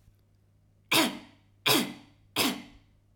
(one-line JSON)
{"three_cough_length": "3.2 s", "three_cough_amplitude": 11323, "three_cough_signal_mean_std_ratio": 0.39, "survey_phase": "alpha (2021-03-01 to 2021-08-12)", "age": "45-64", "gender": "Female", "wearing_mask": "No", "symptom_none": true, "smoker_status": "Never smoked", "respiratory_condition_asthma": false, "respiratory_condition_other": false, "recruitment_source": "REACT", "submission_delay": "1 day", "covid_test_result": "Negative", "covid_test_method": "RT-qPCR"}